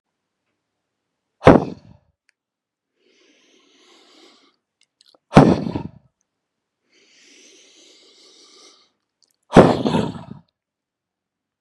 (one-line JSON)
{"exhalation_length": "11.6 s", "exhalation_amplitude": 32768, "exhalation_signal_mean_std_ratio": 0.21, "survey_phase": "beta (2021-08-13 to 2022-03-07)", "age": "45-64", "gender": "Male", "wearing_mask": "No", "symptom_none": true, "smoker_status": "Never smoked", "respiratory_condition_asthma": false, "respiratory_condition_other": false, "recruitment_source": "REACT", "submission_delay": "0 days", "covid_test_result": "Negative", "covid_test_method": "RT-qPCR"}